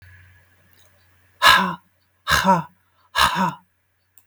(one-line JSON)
{"exhalation_length": "4.3 s", "exhalation_amplitude": 32768, "exhalation_signal_mean_std_ratio": 0.38, "survey_phase": "beta (2021-08-13 to 2022-03-07)", "age": "65+", "gender": "Female", "wearing_mask": "No", "symptom_none": true, "symptom_onset": "12 days", "smoker_status": "Never smoked", "respiratory_condition_asthma": false, "respiratory_condition_other": false, "recruitment_source": "REACT", "submission_delay": "2 days", "covid_test_result": "Negative", "covid_test_method": "RT-qPCR"}